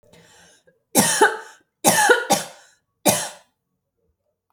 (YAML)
three_cough_length: 4.5 s
three_cough_amplitude: 31718
three_cough_signal_mean_std_ratio: 0.39
survey_phase: alpha (2021-03-01 to 2021-08-12)
age: 18-44
gender: Female
wearing_mask: 'No'
symptom_none: true
smoker_status: Never smoked
respiratory_condition_asthma: false
respiratory_condition_other: false
recruitment_source: REACT
submission_delay: 2 days
covid_test_result: Negative
covid_test_method: RT-qPCR